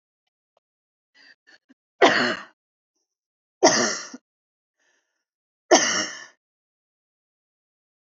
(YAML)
three_cough_length: 8.0 s
three_cough_amplitude: 26795
three_cough_signal_mean_std_ratio: 0.26
survey_phase: beta (2021-08-13 to 2022-03-07)
age: 18-44
gender: Female
wearing_mask: 'No'
symptom_none: true
smoker_status: Never smoked
respiratory_condition_asthma: false
respiratory_condition_other: false
recruitment_source: REACT
submission_delay: 2 days
covid_test_result: Negative
covid_test_method: RT-qPCR
influenza_a_test_result: Negative
influenza_b_test_result: Negative